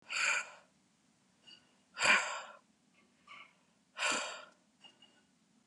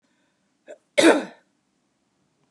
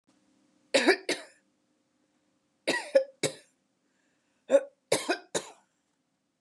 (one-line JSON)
{"exhalation_length": "5.7 s", "exhalation_amplitude": 6266, "exhalation_signal_mean_std_ratio": 0.36, "cough_length": "2.5 s", "cough_amplitude": 24074, "cough_signal_mean_std_ratio": 0.24, "three_cough_length": "6.4 s", "three_cough_amplitude": 12310, "three_cough_signal_mean_std_ratio": 0.29, "survey_phase": "beta (2021-08-13 to 2022-03-07)", "age": "18-44", "gender": "Female", "wearing_mask": "No", "symptom_runny_or_blocked_nose": true, "smoker_status": "Never smoked", "respiratory_condition_asthma": false, "respiratory_condition_other": false, "recruitment_source": "Test and Trace", "submission_delay": "2 days", "covid_test_result": "Negative", "covid_test_method": "RT-qPCR"}